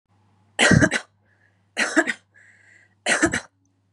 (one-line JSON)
{"three_cough_length": "3.9 s", "three_cough_amplitude": 26870, "three_cough_signal_mean_std_ratio": 0.38, "survey_phase": "beta (2021-08-13 to 2022-03-07)", "age": "18-44", "gender": "Female", "wearing_mask": "No", "symptom_none": true, "smoker_status": "Never smoked", "respiratory_condition_asthma": false, "respiratory_condition_other": false, "recruitment_source": "REACT", "submission_delay": "3 days", "covid_test_result": "Negative", "covid_test_method": "RT-qPCR", "influenza_a_test_result": "Unknown/Void", "influenza_b_test_result": "Unknown/Void"}